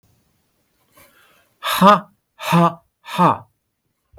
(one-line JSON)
{"exhalation_length": "4.2 s", "exhalation_amplitude": 32768, "exhalation_signal_mean_std_ratio": 0.34, "survey_phase": "beta (2021-08-13 to 2022-03-07)", "age": "65+", "gender": "Male", "wearing_mask": "No", "symptom_none": true, "smoker_status": "Ex-smoker", "respiratory_condition_asthma": false, "respiratory_condition_other": false, "recruitment_source": "REACT", "submission_delay": "2 days", "covid_test_result": "Negative", "covid_test_method": "RT-qPCR", "influenza_a_test_result": "Negative", "influenza_b_test_result": "Negative"}